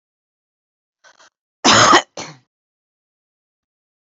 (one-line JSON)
{"cough_length": "4.0 s", "cough_amplitude": 31804, "cough_signal_mean_std_ratio": 0.26, "survey_phase": "beta (2021-08-13 to 2022-03-07)", "age": "65+", "gender": "Female", "wearing_mask": "No", "symptom_cough_any": true, "symptom_runny_or_blocked_nose": true, "smoker_status": "Never smoked", "respiratory_condition_asthma": false, "respiratory_condition_other": false, "recruitment_source": "REACT", "submission_delay": "2 days", "covid_test_result": "Negative", "covid_test_method": "RT-qPCR", "influenza_a_test_result": "Negative", "influenza_b_test_result": "Negative"}